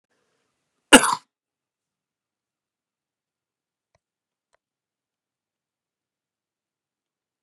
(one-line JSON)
{"cough_length": "7.4 s", "cough_amplitude": 32768, "cough_signal_mean_std_ratio": 0.1, "survey_phase": "beta (2021-08-13 to 2022-03-07)", "age": "45-64", "gender": "Male", "wearing_mask": "No", "symptom_cough_any": true, "symptom_runny_or_blocked_nose": true, "symptom_other": true, "symptom_onset": "5 days", "smoker_status": "Never smoked", "respiratory_condition_asthma": true, "respiratory_condition_other": false, "recruitment_source": "Test and Trace", "submission_delay": "1 day", "covid_test_result": "Negative", "covid_test_method": "RT-qPCR"}